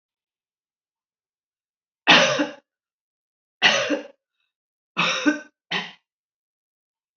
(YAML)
three_cough_length: 7.2 s
three_cough_amplitude: 28233
three_cough_signal_mean_std_ratio: 0.31
survey_phase: alpha (2021-03-01 to 2021-08-12)
age: 65+
gender: Female
wearing_mask: 'No'
symptom_none: true
smoker_status: Ex-smoker
respiratory_condition_asthma: false
respiratory_condition_other: false
recruitment_source: REACT
submission_delay: 2 days
covid_test_result: Negative
covid_test_method: RT-qPCR